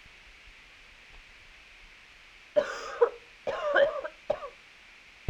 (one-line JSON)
{"cough_length": "5.3 s", "cough_amplitude": 8968, "cough_signal_mean_std_ratio": 0.38, "survey_phase": "alpha (2021-03-01 to 2021-08-12)", "age": "18-44", "gender": "Female", "wearing_mask": "No", "symptom_cough_any": true, "symptom_new_continuous_cough": true, "symptom_shortness_of_breath": true, "symptom_fatigue": true, "symptom_fever_high_temperature": true, "symptom_headache": true, "symptom_onset": "3 days", "smoker_status": "Ex-smoker", "respiratory_condition_asthma": false, "respiratory_condition_other": false, "recruitment_source": "Test and Trace", "submission_delay": "2 days", "covid_test_result": "Positive", "covid_test_method": "RT-qPCR", "covid_ct_value": 17.7, "covid_ct_gene": "ORF1ab gene", "covid_ct_mean": 18.1, "covid_viral_load": "1200000 copies/ml", "covid_viral_load_category": "High viral load (>1M copies/ml)"}